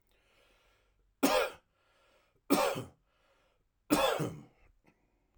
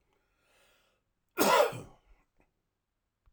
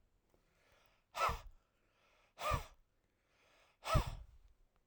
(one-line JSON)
{"three_cough_length": "5.4 s", "three_cough_amplitude": 9148, "three_cough_signal_mean_std_ratio": 0.35, "cough_length": "3.3 s", "cough_amplitude": 7948, "cough_signal_mean_std_ratio": 0.27, "exhalation_length": "4.9 s", "exhalation_amplitude": 3955, "exhalation_signal_mean_std_ratio": 0.32, "survey_phase": "alpha (2021-03-01 to 2021-08-12)", "age": "45-64", "gender": "Male", "wearing_mask": "No", "symptom_none": true, "smoker_status": "Ex-smoker", "respiratory_condition_asthma": false, "respiratory_condition_other": false, "recruitment_source": "REACT", "submission_delay": "2 days", "covid_test_result": "Negative", "covid_test_method": "RT-qPCR"}